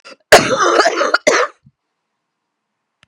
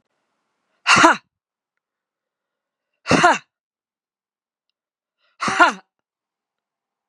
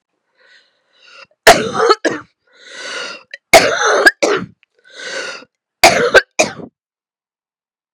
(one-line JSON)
{"cough_length": "3.1 s", "cough_amplitude": 32768, "cough_signal_mean_std_ratio": 0.44, "exhalation_length": "7.1 s", "exhalation_amplitude": 32767, "exhalation_signal_mean_std_ratio": 0.26, "three_cough_length": "7.9 s", "three_cough_amplitude": 32768, "three_cough_signal_mean_std_ratio": 0.38, "survey_phase": "beta (2021-08-13 to 2022-03-07)", "age": "45-64", "gender": "Female", "wearing_mask": "No", "symptom_cough_any": true, "symptom_runny_or_blocked_nose": true, "symptom_sore_throat": true, "symptom_change_to_sense_of_smell_or_taste": true, "symptom_loss_of_taste": true, "symptom_other": true, "symptom_onset": "2 days", "smoker_status": "Never smoked", "respiratory_condition_asthma": false, "respiratory_condition_other": false, "recruitment_source": "Test and Trace", "submission_delay": "1 day", "covid_test_result": "Positive", "covid_test_method": "ePCR"}